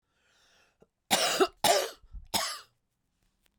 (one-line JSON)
{"three_cough_length": "3.6 s", "three_cough_amplitude": 12535, "three_cough_signal_mean_std_ratio": 0.38, "survey_phase": "beta (2021-08-13 to 2022-03-07)", "age": "45-64", "gender": "Female", "wearing_mask": "No", "symptom_none": true, "smoker_status": "Ex-smoker", "respiratory_condition_asthma": false, "respiratory_condition_other": false, "recruitment_source": "REACT", "submission_delay": "1 day", "covid_test_result": "Negative", "covid_test_method": "RT-qPCR"}